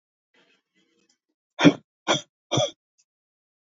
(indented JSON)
{
  "exhalation_length": "3.8 s",
  "exhalation_amplitude": 26334,
  "exhalation_signal_mean_std_ratio": 0.23,
  "survey_phase": "beta (2021-08-13 to 2022-03-07)",
  "age": "18-44",
  "gender": "Female",
  "wearing_mask": "No",
  "symptom_cough_any": true,
  "symptom_sore_throat": true,
  "smoker_status": "Never smoked",
  "respiratory_condition_asthma": false,
  "respiratory_condition_other": false,
  "recruitment_source": "Test and Trace",
  "submission_delay": "2 days",
  "covid_test_result": "Positive",
  "covid_test_method": "RT-qPCR",
  "covid_ct_value": 29.3,
  "covid_ct_gene": "ORF1ab gene"
}